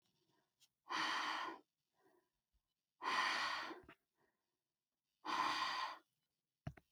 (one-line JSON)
{"exhalation_length": "6.9 s", "exhalation_amplitude": 1809, "exhalation_signal_mean_std_ratio": 0.47, "survey_phase": "alpha (2021-03-01 to 2021-08-12)", "age": "18-44", "gender": "Female", "wearing_mask": "No", "symptom_none": true, "smoker_status": "Never smoked", "respiratory_condition_asthma": false, "respiratory_condition_other": false, "recruitment_source": "REACT", "submission_delay": "1 day", "covid_test_result": "Negative", "covid_test_method": "RT-qPCR"}